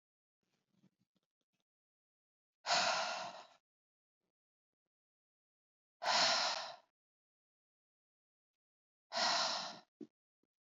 exhalation_length: 10.8 s
exhalation_amplitude: 3290
exhalation_signal_mean_std_ratio: 0.33
survey_phase: beta (2021-08-13 to 2022-03-07)
age: 45-64
gender: Female
wearing_mask: 'No'
symptom_none: true
smoker_status: Never smoked
respiratory_condition_asthma: false
respiratory_condition_other: false
recruitment_source: REACT
submission_delay: 1 day
covid_test_result: Negative
covid_test_method: RT-qPCR
influenza_a_test_result: Negative
influenza_b_test_result: Negative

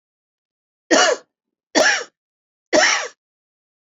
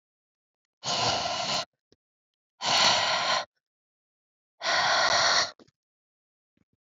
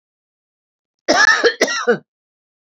three_cough_length: 3.8 s
three_cough_amplitude: 29803
three_cough_signal_mean_std_ratio: 0.38
exhalation_length: 6.8 s
exhalation_amplitude: 12899
exhalation_signal_mean_std_ratio: 0.51
cough_length: 2.7 s
cough_amplitude: 31585
cough_signal_mean_std_ratio: 0.4
survey_phase: beta (2021-08-13 to 2022-03-07)
age: 45-64
gender: Female
wearing_mask: 'No'
symptom_cough_any: true
smoker_status: Ex-smoker
respiratory_condition_asthma: false
respiratory_condition_other: false
recruitment_source: REACT
submission_delay: 2 days
covid_test_result: Negative
covid_test_method: RT-qPCR
influenza_a_test_result: Negative
influenza_b_test_result: Negative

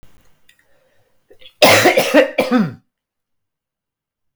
cough_length: 4.4 s
cough_amplitude: 32768
cough_signal_mean_std_ratio: 0.37
survey_phase: beta (2021-08-13 to 2022-03-07)
age: 45-64
gender: Male
wearing_mask: 'No'
symptom_cough_any: true
symptom_runny_or_blocked_nose: true
symptom_fatigue: true
symptom_headache: true
symptom_onset: 2 days
smoker_status: Never smoked
respiratory_condition_asthma: false
respiratory_condition_other: false
recruitment_source: Test and Trace
submission_delay: 2 days
covid_test_result: Positive
covid_test_method: RT-qPCR
covid_ct_value: 17.4
covid_ct_gene: ORF1ab gene
covid_ct_mean: 18.1
covid_viral_load: 1100000 copies/ml
covid_viral_load_category: High viral load (>1M copies/ml)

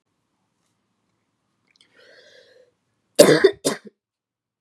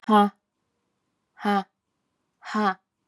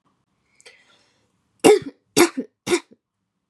cough_length: 4.6 s
cough_amplitude: 32768
cough_signal_mean_std_ratio: 0.21
exhalation_length: 3.1 s
exhalation_amplitude: 16348
exhalation_signal_mean_std_ratio: 0.34
three_cough_length: 3.5 s
three_cough_amplitude: 32767
three_cough_signal_mean_std_ratio: 0.26
survey_phase: beta (2021-08-13 to 2022-03-07)
age: 18-44
gender: Female
wearing_mask: 'No'
symptom_cough_any: true
symptom_new_continuous_cough: true
symptom_sore_throat: true
symptom_fatigue: true
symptom_other: true
symptom_onset: 2 days
smoker_status: Ex-smoker
respiratory_condition_asthma: false
respiratory_condition_other: false
recruitment_source: Test and Trace
submission_delay: 1 day
covid_test_result: Positive
covid_test_method: RT-qPCR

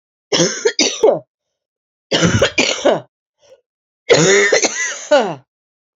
three_cough_length: 6.0 s
three_cough_amplitude: 30412
three_cough_signal_mean_std_ratio: 0.53
survey_phase: beta (2021-08-13 to 2022-03-07)
age: 45-64
gender: Female
wearing_mask: 'No'
symptom_new_continuous_cough: true
symptom_runny_or_blocked_nose: true
symptom_sore_throat: true
symptom_diarrhoea: true
symptom_fatigue: true
symptom_fever_high_temperature: true
symptom_headache: true
symptom_change_to_sense_of_smell_or_taste: true
symptom_onset: 4 days
smoker_status: Never smoked
respiratory_condition_asthma: true
respiratory_condition_other: false
recruitment_source: Test and Trace
submission_delay: 1 day
covid_test_result: Positive
covid_test_method: ePCR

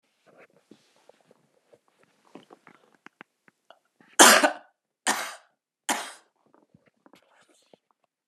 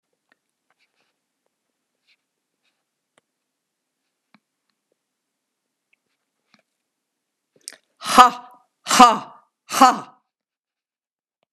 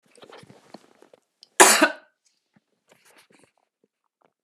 three_cough_length: 8.3 s
three_cough_amplitude: 32768
three_cough_signal_mean_std_ratio: 0.19
exhalation_length: 11.5 s
exhalation_amplitude: 32768
exhalation_signal_mean_std_ratio: 0.17
cough_length: 4.4 s
cough_amplitude: 32768
cough_signal_mean_std_ratio: 0.2
survey_phase: beta (2021-08-13 to 2022-03-07)
age: 65+
gender: Female
wearing_mask: 'No'
symptom_cough_any: true
symptom_shortness_of_breath: true
symptom_headache: true
smoker_status: Ex-smoker
respiratory_condition_asthma: false
respiratory_condition_other: false
recruitment_source: REACT
submission_delay: 2 days
covid_test_result: Negative
covid_test_method: RT-qPCR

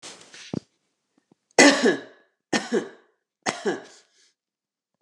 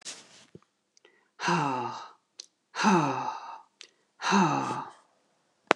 three_cough_length: 5.0 s
three_cough_amplitude: 29120
three_cough_signal_mean_std_ratio: 0.3
exhalation_length: 5.8 s
exhalation_amplitude: 29044
exhalation_signal_mean_std_ratio: 0.44
survey_phase: beta (2021-08-13 to 2022-03-07)
age: 45-64
gender: Female
wearing_mask: 'No'
symptom_none: true
smoker_status: Ex-smoker
respiratory_condition_asthma: false
respiratory_condition_other: false
recruitment_source: REACT
submission_delay: 3 days
covid_test_result: Negative
covid_test_method: RT-qPCR
influenza_a_test_result: Negative
influenza_b_test_result: Negative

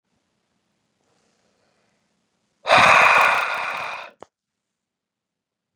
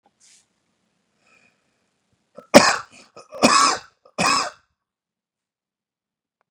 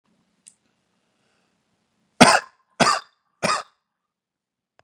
exhalation_length: 5.8 s
exhalation_amplitude: 28445
exhalation_signal_mean_std_ratio: 0.33
cough_length: 6.5 s
cough_amplitude: 32768
cough_signal_mean_std_ratio: 0.26
three_cough_length: 4.8 s
three_cough_amplitude: 32768
three_cough_signal_mean_std_ratio: 0.23
survey_phase: beta (2021-08-13 to 2022-03-07)
age: 18-44
gender: Male
wearing_mask: 'No'
symptom_none: true
smoker_status: Never smoked
respiratory_condition_asthma: true
respiratory_condition_other: false
recruitment_source: REACT
submission_delay: 1 day
covid_test_result: Negative
covid_test_method: RT-qPCR
influenza_a_test_result: Negative
influenza_b_test_result: Negative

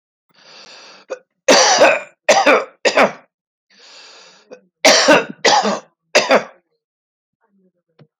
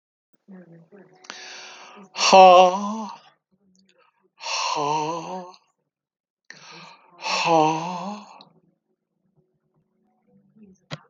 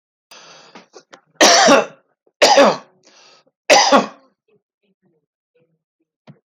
cough_length: 8.2 s
cough_amplitude: 32032
cough_signal_mean_std_ratio: 0.42
exhalation_length: 11.1 s
exhalation_amplitude: 29332
exhalation_signal_mean_std_ratio: 0.32
three_cough_length: 6.5 s
three_cough_amplitude: 32548
three_cough_signal_mean_std_ratio: 0.35
survey_phase: alpha (2021-03-01 to 2021-08-12)
age: 65+
gender: Male
wearing_mask: 'No'
symptom_none: true
smoker_status: Ex-smoker
respiratory_condition_asthma: false
respiratory_condition_other: false
recruitment_source: REACT
submission_delay: 2 days
covid_test_result: Negative
covid_test_method: RT-qPCR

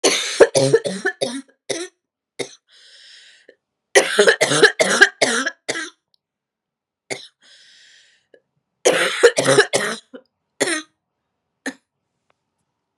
three_cough_length: 13.0 s
three_cough_amplitude: 32768
three_cough_signal_mean_std_ratio: 0.38
survey_phase: beta (2021-08-13 to 2022-03-07)
age: 18-44
gender: Female
wearing_mask: 'No'
symptom_cough_any: true
symptom_runny_or_blocked_nose: true
symptom_fatigue: true
symptom_other: true
symptom_onset: 4 days
smoker_status: Ex-smoker
respiratory_condition_asthma: false
respiratory_condition_other: false
recruitment_source: Test and Trace
submission_delay: 2 days
covid_test_result: Positive
covid_test_method: RT-qPCR
covid_ct_value: 19.6
covid_ct_gene: N gene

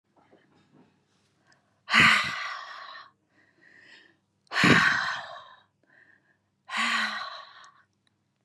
exhalation_length: 8.4 s
exhalation_amplitude: 17443
exhalation_signal_mean_std_ratio: 0.36
survey_phase: beta (2021-08-13 to 2022-03-07)
age: 18-44
gender: Female
wearing_mask: 'No'
symptom_none: true
smoker_status: Never smoked
respiratory_condition_asthma: false
respiratory_condition_other: false
recruitment_source: REACT
submission_delay: 3 days
covid_test_result: Negative
covid_test_method: RT-qPCR
influenza_a_test_result: Negative
influenza_b_test_result: Negative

